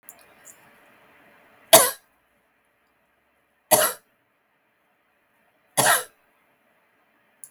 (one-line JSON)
{"three_cough_length": "7.5 s", "three_cough_amplitude": 32768, "three_cough_signal_mean_std_ratio": 0.21, "survey_phase": "beta (2021-08-13 to 2022-03-07)", "age": "65+", "gender": "Female", "wearing_mask": "No", "symptom_none": true, "smoker_status": "Ex-smoker", "respiratory_condition_asthma": false, "respiratory_condition_other": false, "recruitment_source": "REACT", "submission_delay": "1 day", "covid_test_result": "Negative", "covid_test_method": "RT-qPCR"}